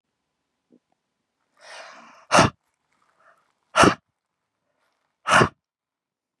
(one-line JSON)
{"exhalation_length": "6.4 s", "exhalation_amplitude": 28136, "exhalation_signal_mean_std_ratio": 0.23, "survey_phase": "beta (2021-08-13 to 2022-03-07)", "age": "45-64", "gender": "Male", "wearing_mask": "No", "symptom_shortness_of_breath": true, "symptom_fatigue": true, "symptom_onset": "4 days", "smoker_status": "Ex-smoker", "respiratory_condition_asthma": false, "respiratory_condition_other": false, "recruitment_source": "Test and Trace", "submission_delay": "2 days", "covid_test_result": "Positive", "covid_test_method": "RT-qPCR", "covid_ct_value": 39.5, "covid_ct_gene": "N gene"}